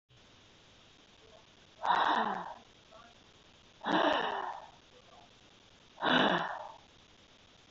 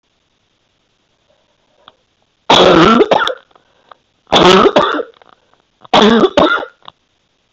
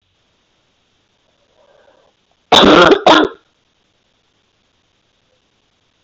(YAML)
exhalation_length: 7.7 s
exhalation_amplitude: 6302
exhalation_signal_mean_std_ratio: 0.43
three_cough_length: 7.5 s
three_cough_amplitude: 32768
three_cough_signal_mean_std_ratio: 0.43
cough_length: 6.0 s
cough_amplitude: 32768
cough_signal_mean_std_ratio: 0.28
survey_phase: beta (2021-08-13 to 2022-03-07)
age: 18-44
gender: Female
wearing_mask: 'No'
symptom_none: true
smoker_status: Current smoker (1 to 10 cigarettes per day)
respiratory_condition_asthma: false
respiratory_condition_other: false
recruitment_source: REACT
submission_delay: 2 days
covid_test_result: Negative
covid_test_method: RT-qPCR